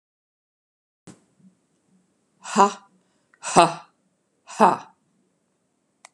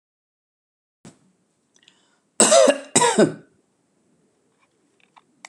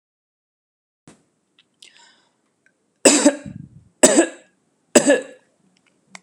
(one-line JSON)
{"exhalation_length": "6.1 s", "exhalation_amplitude": 32768, "exhalation_signal_mean_std_ratio": 0.22, "cough_length": "5.5 s", "cough_amplitude": 32767, "cough_signal_mean_std_ratio": 0.28, "three_cough_length": "6.2 s", "three_cough_amplitude": 32768, "three_cough_signal_mean_std_ratio": 0.27, "survey_phase": "beta (2021-08-13 to 2022-03-07)", "age": "45-64", "gender": "Female", "wearing_mask": "No", "symptom_none": true, "smoker_status": "Never smoked", "respiratory_condition_asthma": false, "respiratory_condition_other": false, "recruitment_source": "REACT", "submission_delay": "1 day", "covid_test_result": "Negative", "covid_test_method": "RT-qPCR"}